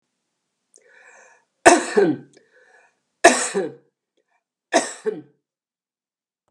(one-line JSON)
{"three_cough_length": "6.5 s", "three_cough_amplitude": 32768, "three_cough_signal_mean_std_ratio": 0.28, "survey_phase": "beta (2021-08-13 to 2022-03-07)", "age": "65+", "gender": "Female", "wearing_mask": "No", "symptom_runny_or_blocked_nose": true, "smoker_status": "Ex-smoker", "respiratory_condition_asthma": false, "respiratory_condition_other": false, "recruitment_source": "REACT", "submission_delay": "3 days", "covid_test_result": "Negative", "covid_test_method": "RT-qPCR", "influenza_a_test_result": "Negative", "influenza_b_test_result": "Negative"}